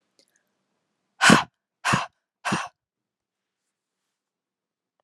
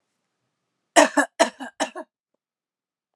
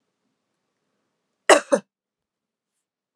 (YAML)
exhalation_length: 5.0 s
exhalation_amplitude: 30778
exhalation_signal_mean_std_ratio: 0.23
three_cough_length: 3.2 s
three_cough_amplitude: 32454
three_cough_signal_mean_std_ratio: 0.25
cough_length: 3.2 s
cough_amplitude: 32383
cough_signal_mean_std_ratio: 0.17
survey_phase: beta (2021-08-13 to 2022-03-07)
age: 18-44
gender: Female
wearing_mask: 'No'
symptom_none: true
smoker_status: Never smoked
respiratory_condition_asthma: false
respiratory_condition_other: false
recruitment_source: Test and Trace
submission_delay: 0 days
covid_test_result: Positive
covid_test_method: LFT